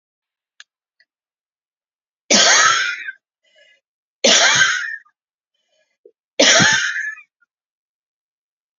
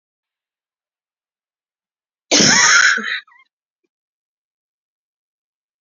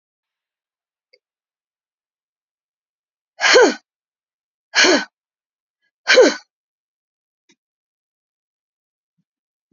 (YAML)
three_cough_length: 8.8 s
three_cough_amplitude: 32767
three_cough_signal_mean_std_ratio: 0.39
cough_length: 5.8 s
cough_amplitude: 32768
cough_signal_mean_std_ratio: 0.3
exhalation_length: 9.7 s
exhalation_amplitude: 31039
exhalation_signal_mean_std_ratio: 0.23
survey_phase: beta (2021-08-13 to 2022-03-07)
age: 45-64
gender: Female
wearing_mask: 'No'
symptom_cough_any: true
symptom_runny_or_blocked_nose: true
symptom_shortness_of_breath: true
symptom_sore_throat: true
symptom_diarrhoea: true
symptom_fatigue: true
symptom_headache: true
symptom_change_to_sense_of_smell_or_taste: true
symptom_loss_of_taste: true
smoker_status: Never smoked
respiratory_condition_asthma: true
respiratory_condition_other: false
recruitment_source: Test and Trace
submission_delay: 1 day
covid_test_result: Positive
covid_test_method: RT-qPCR
covid_ct_value: 14.6
covid_ct_gene: ORF1ab gene
covid_ct_mean: 14.9
covid_viral_load: 13000000 copies/ml
covid_viral_load_category: High viral load (>1M copies/ml)